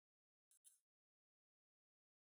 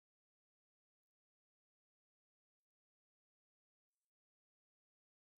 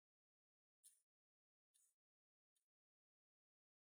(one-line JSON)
{"cough_length": "2.2 s", "cough_amplitude": 83, "cough_signal_mean_std_ratio": 0.2, "exhalation_length": "5.4 s", "exhalation_amplitude": 2, "exhalation_signal_mean_std_ratio": 0.06, "three_cough_length": "3.9 s", "three_cough_amplitude": 63, "three_cough_signal_mean_std_ratio": 0.18, "survey_phase": "beta (2021-08-13 to 2022-03-07)", "age": "45-64", "gender": "Male", "wearing_mask": "No", "symptom_none": true, "smoker_status": "Never smoked", "respiratory_condition_asthma": false, "respiratory_condition_other": false, "recruitment_source": "REACT", "submission_delay": "2 days", "covid_test_result": "Negative", "covid_test_method": "RT-qPCR", "influenza_a_test_result": "Negative", "influenza_b_test_result": "Negative"}